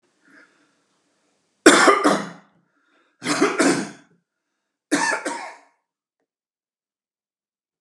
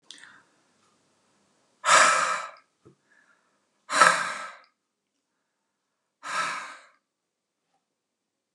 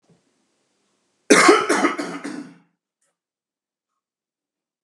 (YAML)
three_cough_length: 7.8 s
three_cough_amplitude: 32768
three_cough_signal_mean_std_ratio: 0.32
exhalation_length: 8.5 s
exhalation_amplitude: 29235
exhalation_signal_mean_std_ratio: 0.29
cough_length: 4.8 s
cough_amplitude: 32765
cough_signal_mean_std_ratio: 0.3
survey_phase: beta (2021-08-13 to 2022-03-07)
age: 45-64
gender: Male
wearing_mask: 'No'
symptom_none: true
smoker_status: Ex-smoker
respiratory_condition_asthma: false
respiratory_condition_other: false
recruitment_source: REACT
submission_delay: 2 days
covid_test_result: Negative
covid_test_method: RT-qPCR